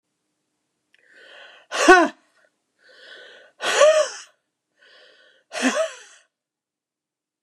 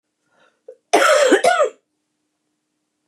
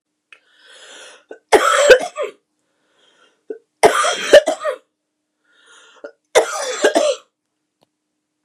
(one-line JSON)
{"exhalation_length": "7.4 s", "exhalation_amplitude": 29203, "exhalation_signal_mean_std_ratio": 0.29, "cough_length": "3.1 s", "cough_amplitude": 28997, "cough_signal_mean_std_ratio": 0.42, "three_cough_length": "8.4 s", "three_cough_amplitude": 29204, "three_cough_signal_mean_std_ratio": 0.35, "survey_phase": "beta (2021-08-13 to 2022-03-07)", "age": "65+", "gender": "Female", "wearing_mask": "No", "symptom_none": true, "smoker_status": "Ex-smoker", "respiratory_condition_asthma": true, "respiratory_condition_other": false, "recruitment_source": "REACT", "submission_delay": "5 days", "covid_test_result": "Negative", "covid_test_method": "RT-qPCR", "influenza_a_test_result": "Negative", "influenza_b_test_result": "Negative"}